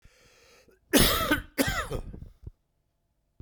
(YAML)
cough_length: 3.4 s
cough_amplitude: 19415
cough_signal_mean_std_ratio: 0.4
survey_phase: beta (2021-08-13 to 2022-03-07)
age: 45-64
gender: Male
wearing_mask: 'No'
symptom_cough_any: true
symptom_runny_or_blocked_nose: true
symptom_change_to_sense_of_smell_or_taste: true
smoker_status: Never smoked
respiratory_condition_asthma: false
respiratory_condition_other: false
recruitment_source: Test and Trace
submission_delay: 2 days
covid_test_result: Positive
covid_test_method: RT-qPCR
covid_ct_value: 19.8
covid_ct_gene: ORF1ab gene